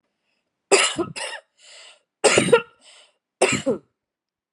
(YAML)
three_cough_length: 4.5 s
three_cough_amplitude: 31276
three_cough_signal_mean_std_ratio: 0.37
survey_phase: beta (2021-08-13 to 2022-03-07)
age: 45-64
gender: Female
wearing_mask: 'No'
symptom_cough_any: true
symptom_new_continuous_cough: true
symptom_runny_or_blocked_nose: true
symptom_shortness_of_breath: true
symptom_abdominal_pain: true
symptom_fatigue: true
symptom_headache: true
symptom_change_to_sense_of_smell_or_taste: true
symptom_loss_of_taste: true
symptom_onset: 4 days
smoker_status: Ex-smoker
respiratory_condition_asthma: false
respiratory_condition_other: false
recruitment_source: Test and Trace
submission_delay: 1 day
covid_test_result: Positive
covid_test_method: RT-qPCR
covid_ct_value: 17.8
covid_ct_gene: ORF1ab gene
covid_ct_mean: 18.3
covid_viral_load: 1000000 copies/ml
covid_viral_load_category: High viral load (>1M copies/ml)